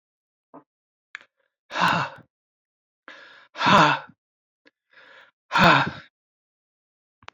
{"exhalation_length": "7.3 s", "exhalation_amplitude": 25016, "exhalation_signal_mean_std_ratio": 0.3, "survey_phase": "alpha (2021-03-01 to 2021-08-12)", "age": "65+", "gender": "Male", "wearing_mask": "No", "symptom_none": true, "smoker_status": "Never smoked", "respiratory_condition_asthma": false, "respiratory_condition_other": false, "recruitment_source": "REACT", "submission_delay": "1 day", "covid_test_result": "Negative", "covid_test_method": "RT-qPCR"}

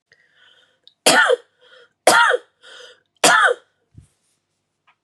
{"three_cough_length": "5.0 s", "three_cough_amplitude": 32768, "three_cough_signal_mean_std_ratio": 0.36, "survey_phase": "beta (2021-08-13 to 2022-03-07)", "age": "18-44", "gender": "Female", "wearing_mask": "No", "symptom_cough_any": true, "symptom_new_continuous_cough": true, "symptom_runny_or_blocked_nose": true, "symptom_sore_throat": true, "symptom_fatigue": true, "smoker_status": "Ex-smoker", "respiratory_condition_asthma": true, "respiratory_condition_other": false, "recruitment_source": "Test and Trace", "submission_delay": "0 days", "covid_test_result": "Positive", "covid_test_method": "LFT"}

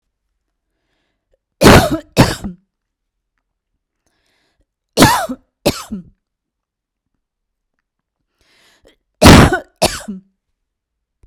{"three_cough_length": "11.3 s", "three_cough_amplitude": 32768, "three_cough_signal_mean_std_ratio": 0.27, "survey_phase": "beta (2021-08-13 to 2022-03-07)", "age": "45-64", "gender": "Female", "wearing_mask": "No", "symptom_none": true, "smoker_status": "Ex-smoker", "respiratory_condition_asthma": false, "respiratory_condition_other": false, "recruitment_source": "REACT", "submission_delay": "0 days", "covid_test_result": "Negative", "covid_test_method": "RT-qPCR"}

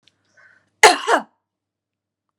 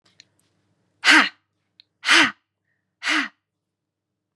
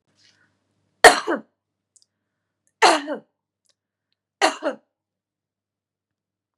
{"cough_length": "2.4 s", "cough_amplitude": 32768, "cough_signal_mean_std_ratio": 0.24, "exhalation_length": "4.4 s", "exhalation_amplitude": 29775, "exhalation_signal_mean_std_ratio": 0.3, "three_cough_length": "6.6 s", "three_cough_amplitude": 32768, "three_cough_signal_mean_std_ratio": 0.21, "survey_phase": "beta (2021-08-13 to 2022-03-07)", "age": "65+", "gender": "Female", "wearing_mask": "No", "symptom_none": true, "symptom_onset": "4 days", "smoker_status": "Current smoker (1 to 10 cigarettes per day)", "respiratory_condition_asthma": false, "respiratory_condition_other": false, "recruitment_source": "REACT", "submission_delay": "1 day", "covid_test_result": "Negative", "covid_test_method": "RT-qPCR", "influenza_a_test_result": "Negative", "influenza_b_test_result": "Negative"}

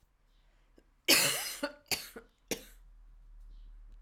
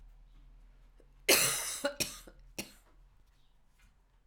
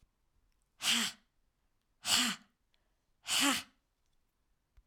{"three_cough_length": "4.0 s", "three_cough_amplitude": 10271, "three_cough_signal_mean_std_ratio": 0.35, "cough_length": "4.3 s", "cough_amplitude": 11122, "cough_signal_mean_std_ratio": 0.34, "exhalation_length": "4.9 s", "exhalation_amplitude": 6517, "exhalation_signal_mean_std_ratio": 0.35, "survey_phase": "alpha (2021-03-01 to 2021-08-12)", "age": "45-64", "gender": "Female", "wearing_mask": "Yes", "symptom_new_continuous_cough": true, "symptom_headache": true, "symptom_change_to_sense_of_smell_or_taste": true, "symptom_loss_of_taste": true, "symptom_onset": "5 days", "smoker_status": "Never smoked", "respiratory_condition_asthma": false, "respiratory_condition_other": false, "recruitment_source": "Test and Trace", "submission_delay": "2 days", "covid_test_result": "Positive", "covid_test_method": "RT-qPCR", "covid_ct_value": 19.8, "covid_ct_gene": "N gene"}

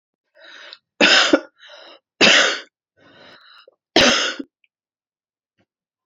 {"three_cough_length": "6.1 s", "three_cough_amplitude": 32767, "three_cough_signal_mean_std_ratio": 0.35, "survey_phase": "beta (2021-08-13 to 2022-03-07)", "age": "18-44", "gender": "Female", "wearing_mask": "No", "symptom_sore_throat": true, "symptom_fatigue": true, "symptom_headache": true, "symptom_onset": "2 days", "smoker_status": "Current smoker (e-cigarettes or vapes only)", "respiratory_condition_asthma": false, "respiratory_condition_other": false, "recruitment_source": "Test and Trace", "submission_delay": "2 days", "covid_test_result": "Negative", "covid_test_method": "RT-qPCR"}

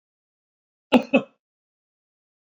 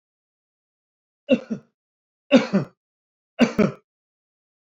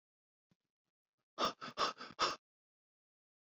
{"cough_length": "2.5 s", "cough_amplitude": 22928, "cough_signal_mean_std_ratio": 0.19, "three_cough_length": "4.8 s", "three_cough_amplitude": 26224, "three_cough_signal_mean_std_ratio": 0.26, "exhalation_length": "3.6 s", "exhalation_amplitude": 2903, "exhalation_signal_mean_std_ratio": 0.29, "survey_phase": "beta (2021-08-13 to 2022-03-07)", "age": "45-64", "gender": "Male", "wearing_mask": "No", "symptom_none": true, "smoker_status": "Never smoked", "respiratory_condition_asthma": false, "respiratory_condition_other": false, "recruitment_source": "REACT", "submission_delay": "2 days", "covid_test_result": "Negative", "covid_test_method": "RT-qPCR"}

